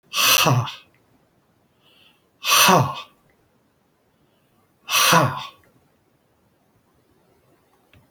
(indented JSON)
{
  "exhalation_length": "8.1 s",
  "exhalation_amplitude": 27413,
  "exhalation_signal_mean_std_ratio": 0.35,
  "survey_phase": "beta (2021-08-13 to 2022-03-07)",
  "age": "65+",
  "gender": "Male",
  "wearing_mask": "No",
  "symptom_none": true,
  "smoker_status": "Ex-smoker",
  "respiratory_condition_asthma": false,
  "respiratory_condition_other": false,
  "recruitment_source": "REACT",
  "submission_delay": "2 days",
  "covid_test_result": "Negative",
  "covid_test_method": "RT-qPCR"
}